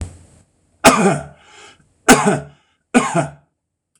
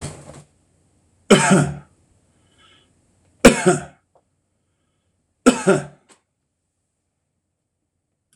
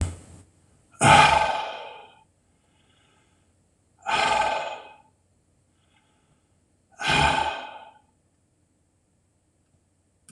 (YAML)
cough_length: 4.0 s
cough_amplitude: 26028
cough_signal_mean_std_ratio: 0.39
three_cough_length: 8.4 s
three_cough_amplitude: 26028
three_cough_signal_mean_std_ratio: 0.26
exhalation_length: 10.3 s
exhalation_amplitude: 25254
exhalation_signal_mean_std_ratio: 0.34
survey_phase: beta (2021-08-13 to 2022-03-07)
age: 45-64
gender: Male
wearing_mask: 'No'
symptom_none: true
symptom_onset: 12 days
smoker_status: Never smoked
respiratory_condition_asthma: false
respiratory_condition_other: false
recruitment_source: REACT
submission_delay: 2 days
covid_test_result: Negative
covid_test_method: RT-qPCR